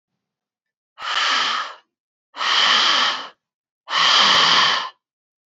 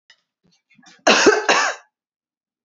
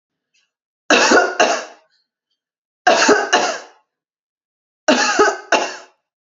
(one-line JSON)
{"exhalation_length": "5.5 s", "exhalation_amplitude": 24360, "exhalation_signal_mean_std_ratio": 0.58, "cough_length": "2.6 s", "cough_amplitude": 31086, "cough_signal_mean_std_ratio": 0.38, "three_cough_length": "6.3 s", "three_cough_amplitude": 31004, "three_cough_signal_mean_std_ratio": 0.45, "survey_phase": "alpha (2021-03-01 to 2021-08-12)", "age": "18-44", "gender": "Female", "wearing_mask": "No", "symptom_none": true, "symptom_onset": "12 days", "smoker_status": "Ex-smoker", "respiratory_condition_asthma": false, "respiratory_condition_other": false, "recruitment_source": "REACT", "submission_delay": "1 day", "covid_test_result": "Negative", "covid_test_method": "RT-qPCR"}